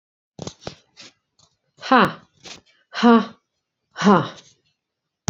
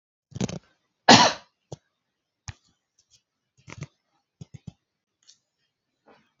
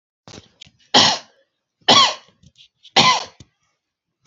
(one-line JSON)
{"exhalation_length": "5.3 s", "exhalation_amplitude": 27938, "exhalation_signal_mean_std_ratio": 0.29, "cough_length": "6.4 s", "cough_amplitude": 32767, "cough_signal_mean_std_ratio": 0.17, "three_cough_length": "4.3 s", "three_cough_amplitude": 31521, "three_cough_signal_mean_std_ratio": 0.33, "survey_phase": "beta (2021-08-13 to 2022-03-07)", "age": "65+", "gender": "Female", "wearing_mask": "No", "symptom_none": true, "smoker_status": "Ex-smoker", "respiratory_condition_asthma": false, "respiratory_condition_other": false, "recruitment_source": "REACT", "submission_delay": "2 days", "covid_test_result": "Negative", "covid_test_method": "RT-qPCR", "influenza_a_test_result": "Negative", "influenza_b_test_result": "Negative"}